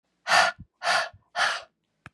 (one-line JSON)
{"exhalation_length": "2.1 s", "exhalation_amplitude": 15988, "exhalation_signal_mean_std_ratio": 0.46, "survey_phase": "beta (2021-08-13 to 2022-03-07)", "age": "45-64", "gender": "Female", "wearing_mask": "No", "symptom_cough_any": true, "symptom_runny_or_blocked_nose": true, "symptom_change_to_sense_of_smell_or_taste": true, "symptom_loss_of_taste": true, "symptom_onset": "9 days", "smoker_status": "Ex-smoker", "respiratory_condition_asthma": false, "respiratory_condition_other": false, "recruitment_source": "Test and Trace", "submission_delay": "2 days", "covid_test_result": "Positive", "covid_test_method": "RT-qPCR", "covid_ct_value": 18.8, "covid_ct_gene": "ORF1ab gene"}